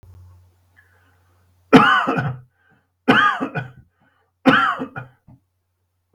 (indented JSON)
{
  "three_cough_length": "6.1 s",
  "three_cough_amplitude": 32768,
  "three_cough_signal_mean_std_ratio": 0.37,
  "survey_phase": "beta (2021-08-13 to 2022-03-07)",
  "age": "45-64",
  "gender": "Male",
  "wearing_mask": "No",
  "symptom_fatigue": true,
  "symptom_onset": "3 days",
  "smoker_status": "Never smoked",
  "respiratory_condition_asthma": true,
  "respiratory_condition_other": false,
  "recruitment_source": "Test and Trace",
  "submission_delay": "1 day",
  "covid_test_result": "Negative",
  "covid_test_method": "ePCR"
}